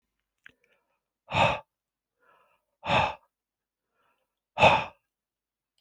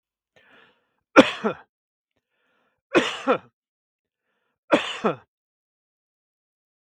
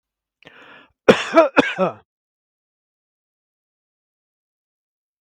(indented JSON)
{
  "exhalation_length": "5.8 s",
  "exhalation_amplitude": 19515,
  "exhalation_signal_mean_std_ratio": 0.27,
  "three_cough_length": "6.9 s",
  "three_cough_amplitude": 32768,
  "three_cough_signal_mean_std_ratio": 0.22,
  "cough_length": "5.2 s",
  "cough_amplitude": 32768,
  "cough_signal_mean_std_ratio": 0.23,
  "survey_phase": "beta (2021-08-13 to 2022-03-07)",
  "age": "65+",
  "gender": "Male",
  "wearing_mask": "No",
  "symptom_none": true,
  "symptom_onset": "12 days",
  "smoker_status": "Never smoked",
  "respiratory_condition_asthma": false,
  "respiratory_condition_other": false,
  "recruitment_source": "REACT",
  "submission_delay": "7 days",
  "covid_test_result": "Negative",
  "covid_test_method": "RT-qPCR",
  "influenza_a_test_result": "Negative",
  "influenza_b_test_result": "Negative"
}